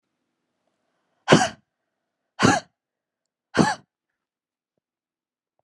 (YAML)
exhalation_length: 5.6 s
exhalation_amplitude: 31018
exhalation_signal_mean_std_ratio: 0.23
survey_phase: beta (2021-08-13 to 2022-03-07)
age: 45-64
gender: Female
wearing_mask: 'No'
symptom_cough_any: true
symptom_runny_or_blocked_nose: true
symptom_shortness_of_breath: true
symptom_fatigue: true
symptom_headache: true
symptom_change_to_sense_of_smell_or_taste: true
symptom_onset: 7 days
smoker_status: Never smoked
respiratory_condition_asthma: false
respiratory_condition_other: false
recruitment_source: Test and Trace
submission_delay: 2 days
covid_test_result: Positive
covid_test_method: RT-qPCR
covid_ct_value: 17.5
covid_ct_gene: ORF1ab gene
covid_ct_mean: 19.1
covid_viral_load: 550000 copies/ml
covid_viral_load_category: Low viral load (10K-1M copies/ml)